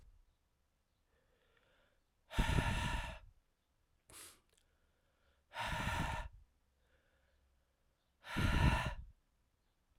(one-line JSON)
{"exhalation_length": "10.0 s", "exhalation_amplitude": 3785, "exhalation_signal_mean_std_ratio": 0.37, "survey_phase": "alpha (2021-03-01 to 2021-08-12)", "age": "18-44", "gender": "Male", "wearing_mask": "No", "symptom_new_continuous_cough": true, "symptom_shortness_of_breath": true, "symptom_diarrhoea": true, "symptom_fatigue": true, "symptom_fever_high_temperature": true, "symptom_headache": true, "symptom_onset": "8 days", "smoker_status": "Ex-smoker", "respiratory_condition_asthma": false, "respiratory_condition_other": false, "recruitment_source": "Test and Trace", "submission_delay": "1 day", "covid_test_result": "Positive", "covid_test_method": "RT-qPCR", "covid_ct_value": 17.8, "covid_ct_gene": "N gene"}